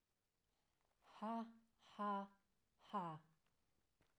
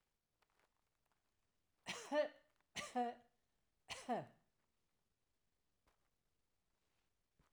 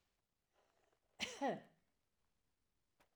{"exhalation_length": "4.2 s", "exhalation_amplitude": 593, "exhalation_signal_mean_std_ratio": 0.4, "three_cough_length": "7.5 s", "three_cough_amplitude": 1204, "three_cough_signal_mean_std_ratio": 0.27, "cough_length": "3.2 s", "cough_amplitude": 1210, "cough_signal_mean_std_ratio": 0.27, "survey_phase": "alpha (2021-03-01 to 2021-08-12)", "age": "45-64", "gender": "Female", "wearing_mask": "No", "symptom_none": true, "smoker_status": "Never smoked", "respiratory_condition_asthma": false, "respiratory_condition_other": false, "recruitment_source": "REACT", "submission_delay": "2 days", "covid_test_result": "Negative", "covid_test_method": "RT-qPCR"}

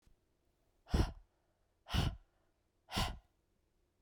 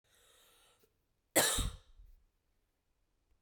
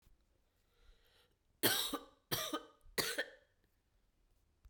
{"exhalation_length": "4.0 s", "exhalation_amplitude": 3255, "exhalation_signal_mean_std_ratio": 0.32, "cough_length": "3.4 s", "cough_amplitude": 6526, "cough_signal_mean_std_ratio": 0.26, "three_cough_length": "4.7 s", "three_cough_amplitude": 4992, "three_cough_signal_mean_std_ratio": 0.35, "survey_phase": "beta (2021-08-13 to 2022-03-07)", "age": "18-44", "gender": "Female", "wearing_mask": "No", "symptom_cough_any": true, "symptom_runny_or_blocked_nose": true, "symptom_fatigue": true, "symptom_fever_high_temperature": true, "symptom_change_to_sense_of_smell_or_taste": true, "symptom_loss_of_taste": true, "symptom_onset": "3 days", "smoker_status": "Never smoked", "respiratory_condition_asthma": true, "respiratory_condition_other": false, "recruitment_source": "Test and Trace", "submission_delay": "1 day", "covid_test_result": "Positive", "covid_test_method": "RT-qPCR", "covid_ct_value": 15.7, "covid_ct_gene": "ORF1ab gene", "covid_ct_mean": 16.1, "covid_viral_load": "5200000 copies/ml", "covid_viral_load_category": "High viral load (>1M copies/ml)"}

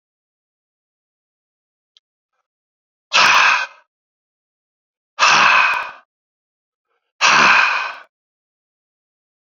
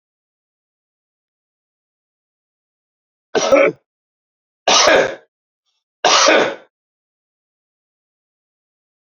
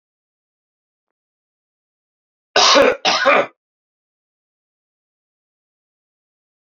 {"exhalation_length": "9.6 s", "exhalation_amplitude": 32768, "exhalation_signal_mean_std_ratio": 0.36, "three_cough_length": "9.0 s", "three_cough_amplitude": 32767, "three_cough_signal_mean_std_ratio": 0.3, "cough_length": "6.7 s", "cough_amplitude": 32767, "cough_signal_mean_std_ratio": 0.27, "survey_phase": "beta (2021-08-13 to 2022-03-07)", "age": "45-64", "gender": "Male", "wearing_mask": "No", "symptom_cough_any": true, "symptom_new_continuous_cough": true, "symptom_runny_or_blocked_nose": true, "symptom_sore_throat": true, "symptom_fatigue": true, "symptom_headache": true, "symptom_onset": "3 days", "smoker_status": "Never smoked", "respiratory_condition_asthma": false, "respiratory_condition_other": false, "recruitment_source": "Test and Trace", "submission_delay": "2 days", "covid_test_result": "Positive", "covid_test_method": "RT-qPCR"}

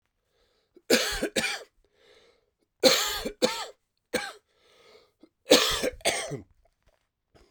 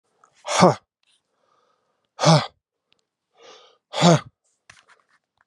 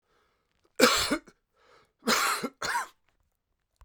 {"three_cough_length": "7.5 s", "three_cough_amplitude": 23865, "three_cough_signal_mean_std_ratio": 0.37, "exhalation_length": "5.5 s", "exhalation_amplitude": 29437, "exhalation_signal_mean_std_ratio": 0.28, "cough_length": "3.8 s", "cough_amplitude": 20144, "cough_signal_mean_std_ratio": 0.39, "survey_phase": "beta (2021-08-13 to 2022-03-07)", "age": "45-64", "gender": "Male", "wearing_mask": "No", "symptom_cough_any": true, "symptom_fatigue": true, "symptom_headache": true, "symptom_loss_of_taste": true, "symptom_onset": "9 days", "smoker_status": "Ex-smoker", "respiratory_condition_asthma": false, "respiratory_condition_other": false, "recruitment_source": "Test and Trace", "submission_delay": "2 days", "covid_test_result": "Positive", "covid_test_method": "RT-qPCR", "covid_ct_value": 16.7, "covid_ct_gene": "ORF1ab gene"}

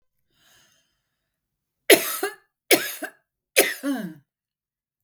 {"three_cough_length": "5.0 s", "three_cough_amplitude": 32768, "three_cough_signal_mean_std_ratio": 0.27, "survey_phase": "beta (2021-08-13 to 2022-03-07)", "age": "65+", "gender": "Female", "wearing_mask": "No", "symptom_none": true, "symptom_onset": "4 days", "smoker_status": "Never smoked", "respiratory_condition_asthma": false, "respiratory_condition_other": false, "recruitment_source": "REACT", "submission_delay": "5 days", "covid_test_result": "Negative", "covid_test_method": "RT-qPCR", "influenza_a_test_result": "Unknown/Void", "influenza_b_test_result": "Unknown/Void"}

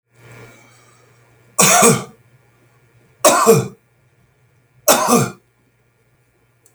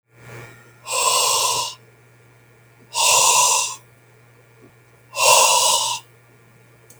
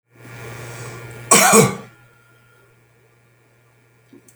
{"three_cough_length": "6.7 s", "three_cough_amplitude": 32768, "three_cough_signal_mean_std_ratio": 0.36, "exhalation_length": "7.0 s", "exhalation_amplitude": 31154, "exhalation_signal_mean_std_ratio": 0.52, "cough_length": "4.4 s", "cough_amplitude": 32768, "cough_signal_mean_std_ratio": 0.31, "survey_phase": "beta (2021-08-13 to 2022-03-07)", "age": "65+", "gender": "Male", "wearing_mask": "No", "symptom_none": true, "smoker_status": "Ex-smoker", "respiratory_condition_asthma": false, "respiratory_condition_other": false, "recruitment_source": "REACT", "submission_delay": "8 days", "covid_test_result": "Negative", "covid_test_method": "RT-qPCR", "influenza_a_test_result": "Negative", "influenza_b_test_result": "Negative"}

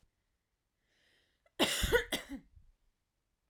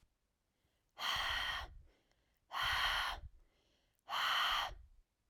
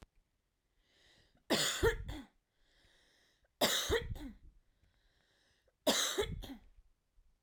{"cough_length": "3.5 s", "cough_amplitude": 5364, "cough_signal_mean_std_ratio": 0.31, "exhalation_length": "5.3 s", "exhalation_amplitude": 2209, "exhalation_signal_mean_std_ratio": 0.56, "three_cough_length": "7.4 s", "three_cough_amplitude": 4411, "three_cough_signal_mean_std_ratio": 0.39, "survey_phase": "alpha (2021-03-01 to 2021-08-12)", "age": "18-44", "gender": "Female", "wearing_mask": "No", "symptom_none": true, "symptom_onset": "8 days", "smoker_status": "Never smoked", "respiratory_condition_asthma": true, "respiratory_condition_other": false, "recruitment_source": "REACT", "submission_delay": "1 day", "covid_test_result": "Negative", "covid_test_method": "RT-qPCR"}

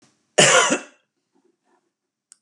{"cough_length": "2.4 s", "cough_amplitude": 29237, "cough_signal_mean_std_ratio": 0.32, "survey_phase": "beta (2021-08-13 to 2022-03-07)", "age": "45-64", "gender": "Male", "wearing_mask": "No", "symptom_none": true, "smoker_status": "Never smoked", "respiratory_condition_asthma": false, "respiratory_condition_other": false, "recruitment_source": "REACT", "submission_delay": "3 days", "covid_test_result": "Negative", "covid_test_method": "RT-qPCR", "influenza_a_test_result": "Negative", "influenza_b_test_result": "Negative"}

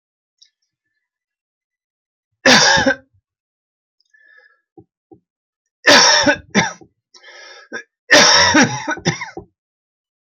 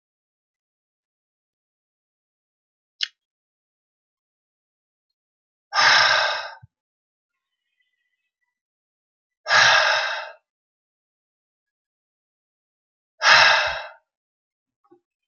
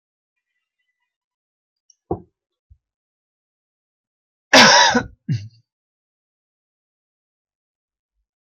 {"three_cough_length": "10.3 s", "three_cough_amplitude": 32767, "three_cough_signal_mean_std_ratio": 0.36, "exhalation_length": "15.3 s", "exhalation_amplitude": 30922, "exhalation_signal_mean_std_ratio": 0.28, "cough_length": "8.4 s", "cough_amplitude": 32767, "cough_signal_mean_std_ratio": 0.21, "survey_phase": "beta (2021-08-13 to 2022-03-07)", "age": "45-64", "gender": "Male", "wearing_mask": "No", "symptom_none": true, "smoker_status": "Ex-smoker", "respiratory_condition_asthma": false, "respiratory_condition_other": false, "recruitment_source": "REACT", "submission_delay": "2 days", "covid_test_result": "Negative", "covid_test_method": "RT-qPCR"}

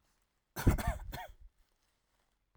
{"cough_length": "2.6 s", "cough_amplitude": 5774, "cough_signal_mean_std_ratio": 0.31, "survey_phase": "alpha (2021-03-01 to 2021-08-12)", "age": "18-44", "gender": "Male", "wearing_mask": "No", "symptom_none": true, "smoker_status": "Never smoked", "respiratory_condition_asthma": false, "respiratory_condition_other": false, "recruitment_source": "REACT", "submission_delay": "1 day", "covid_test_result": "Negative", "covid_test_method": "RT-qPCR"}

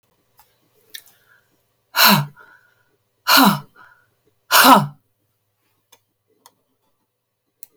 {"exhalation_length": "7.8 s", "exhalation_amplitude": 32768, "exhalation_signal_mean_std_ratio": 0.28, "survey_phase": "beta (2021-08-13 to 2022-03-07)", "age": "65+", "gender": "Female", "wearing_mask": "No", "symptom_cough_any": true, "symptom_runny_or_blocked_nose": true, "symptom_headache": true, "symptom_onset": "12 days", "smoker_status": "Never smoked", "respiratory_condition_asthma": false, "respiratory_condition_other": false, "recruitment_source": "REACT", "submission_delay": "2 days", "covid_test_result": "Negative", "covid_test_method": "RT-qPCR"}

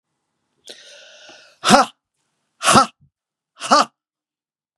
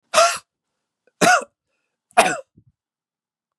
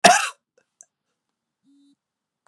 {"exhalation_length": "4.8 s", "exhalation_amplitude": 32768, "exhalation_signal_mean_std_ratio": 0.28, "three_cough_length": "3.6 s", "three_cough_amplitude": 32767, "three_cough_signal_mean_std_ratio": 0.31, "cough_length": "2.5 s", "cough_amplitude": 32626, "cough_signal_mean_std_ratio": 0.21, "survey_phase": "beta (2021-08-13 to 2022-03-07)", "age": "45-64", "gender": "Male", "wearing_mask": "No", "symptom_none": true, "smoker_status": "Never smoked", "respiratory_condition_asthma": false, "respiratory_condition_other": false, "recruitment_source": "Test and Trace", "submission_delay": "2 days", "covid_test_result": "Positive", "covid_test_method": "RT-qPCR", "covid_ct_value": 17.3, "covid_ct_gene": "ORF1ab gene", "covid_ct_mean": 17.7, "covid_viral_load": "1600000 copies/ml", "covid_viral_load_category": "High viral load (>1M copies/ml)"}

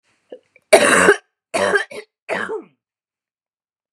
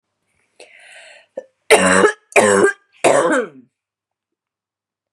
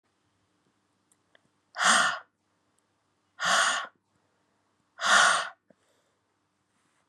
{"cough_length": "3.9 s", "cough_amplitude": 32768, "cough_signal_mean_std_ratio": 0.37, "three_cough_length": "5.1 s", "three_cough_amplitude": 32768, "three_cough_signal_mean_std_ratio": 0.4, "exhalation_length": "7.1 s", "exhalation_amplitude": 15968, "exhalation_signal_mean_std_ratio": 0.33, "survey_phase": "beta (2021-08-13 to 2022-03-07)", "age": "45-64", "gender": "Female", "wearing_mask": "No", "symptom_cough_any": true, "symptom_runny_or_blocked_nose": true, "symptom_shortness_of_breath": true, "symptom_fatigue": true, "symptom_onset": "5 days", "smoker_status": "Never smoked", "respiratory_condition_asthma": false, "respiratory_condition_other": false, "recruitment_source": "Test and Trace", "submission_delay": "4 days", "covid_test_result": "Positive", "covid_test_method": "RT-qPCR", "covid_ct_value": 17.9, "covid_ct_gene": "ORF1ab gene", "covid_ct_mean": 19.0, "covid_viral_load": "600000 copies/ml", "covid_viral_load_category": "Low viral load (10K-1M copies/ml)"}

